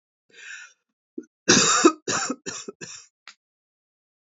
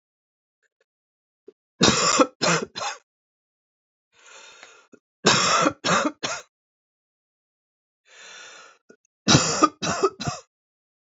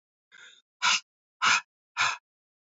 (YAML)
cough_length: 4.4 s
cough_amplitude: 26166
cough_signal_mean_std_ratio: 0.33
three_cough_length: 11.2 s
three_cough_amplitude: 25452
three_cough_signal_mean_std_ratio: 0.36
exhalation_length: 2.6 s
exhalation_amplitude: 9672
exhalation_signal_mean_std_ratio: 0.36
survey_phase: beta (2021-08-13 to 2022-03-07)
age: 45-64
gender: Female
wearing_mask: 'No'
symptom_cough_any: true
symptom_shortness_of_breath: true
symptom_sore_throat: true
smoker_status: Ex-smoker
respiratory_condition_asthma: false
respiratory_condition_other: false
recruitment_source: Test and Trace
submission_delay: 2 days
covid_test_result: Negative
covid_test_method: RT-qPCR